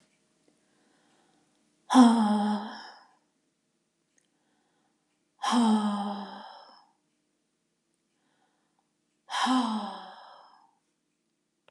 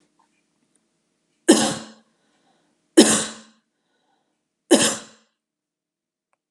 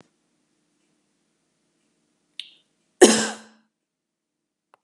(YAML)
exhalation_length: 11.7 s
exhalation_amplitude: 17011
exhalation_signal_mean_std_ratio: 0.33
three_cough_length: 6.5 s
three_cough_amplitude: 32269
three_cough_signal_mean_std_ratio: 0.25
cough_length: 4.8 s
cough_amplitude: 32634
cough_signal_mean_std_ratio: 0.16
survey_phase: beta (2021-08-13 to 2022-03-07)
age: 45-64
gender: Female
wearing_mask: 'No'
symptom_runny_or_blocked_nose: true
symptom_change_to_sense_of_smell_or_taste: true
smoker_status: Never smoked
respiratory_condition_asthma: false
respiratory_condition_other: false
recruitment_source: REACT
submission_delay: 1 day
covid_test_result: Negative
covid_test_method: RT-qPCR